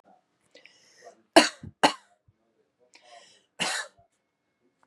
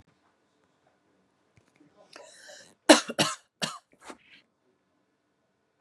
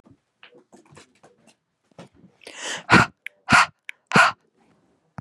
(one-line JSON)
{"cough_length": "4.9 s", "cough_amplitude": 27905, "cough_signal_mean_std_ratio": 0.19, "three_cough_length": "5.8 s", "three_cough_amplitude": 30855, "three_cough_signal_mean_std_ratio": 0.17, "exhalation_length": "5.2 s", "exhalation_amplitude": 29950, "exhalation_signal_mean_std_ratio": 0.27, "survey_phase": "beta (2021-08-13 to 2022-03-07)", "age": "45-64", "gender": "Female", "wearing_mask": "No", "symptom_none": true, "smoker_status": "Never smoked", "respiratory_condition_asthma": false, "respiratory_condition_other": false, "recruitment_source": "REACT", "submission_delay": "7 days", "covid_test_result": "Negative", "covid_test_method": "RT-qPCR", "influenza_a_test_result": "Negative", "influenza_b_test_result": "Negative"}